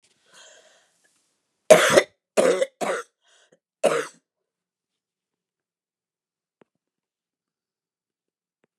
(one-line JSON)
{"cough_length": "8.8 s", "cough_amplitude": 29204, "cough_signal_mean_std_ratio": 0.23, "survey_phase": "beta (2021-08-13 to 2022-03-07)", "age": "65+", "gender": "Female", "wearing_mask": "No", "symptom_none": true, "smoker_status": "Never smoked", "respiratory_condition_asthma": false, "respiratory_condition_other": false, "recruitment_source": "REACT", "submission_delay": "1 day", "covid_test_result": "Negative", "covid_test_method": "RT-qPCR", "influenza_a_test_result": "Negative", "influenza_b_test_result": "Negative"}